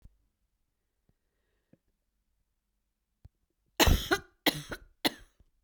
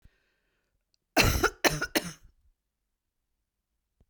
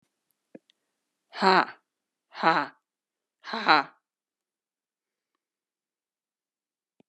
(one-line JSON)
{"cough_length": "5.6 s", "cough_amplitude": 12715, "cough_signal_mean_std_ratio": 0.22, "three_cough_length": "4.1 s", "three_cough_amplitude": 17424, "three_cough_signal_mean_std_ratio": 0.28, "exhalation_length": "7.1 s", "exhalation_amplitude": 22821, "exhalation_signal_mean_std_ratio": 0.22, "survey_phase": "beta (2021-08-13 to 2022-03-07)", "age": "45-64", "gender": "Female", "wearing_mask": "No", "symptom_cough_any": true, "symptom_runny_or_blocked_nose": true, "symptom_shortness_of_breath": true, "symptom_sore_throat": true, "symptom_abdominal_pain": true, "symptom_fatigue": true, "symptom_headache": true, "symptom_change_to_sense_of_smell_or_taste": true, "symptom_loss_of_taste": true, "symptom_onset": "5 days", "smoker_status": "Never smoked", "respiratory_condition_asthma": false, "respiratory_condition_other": false, "recruitment_source": "Test and Trace", "submission_delay": "2 days", "covid_test_result": "Positive", "covid_test_method": "RT-qPCR"}